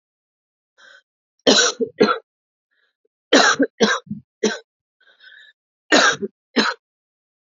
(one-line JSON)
{"cough_length": "7.5 s", "cough_amplitude": 29703, "cough_signal_mean_std_ratio": 0.36, "survey_phase": "alpha (2021-03-01 to 2021-08-12)", "age": "18-44", "gender": "Female", "wearing_mask": "No", "symptom_change_to_sense_of_smell_or_taste": true, "symptom_loss_of_taste": true, "symptom_onset": "2 days", "smoker_status": "Never smoked", "respiratory_condition_asthma": false, "respiratory_condition_other": false, "recruitment_source": "Test and Trace", "submission_delay": "2 days", "covid_test_result": "Positive", "covid_test_method": "RT-qPCR"}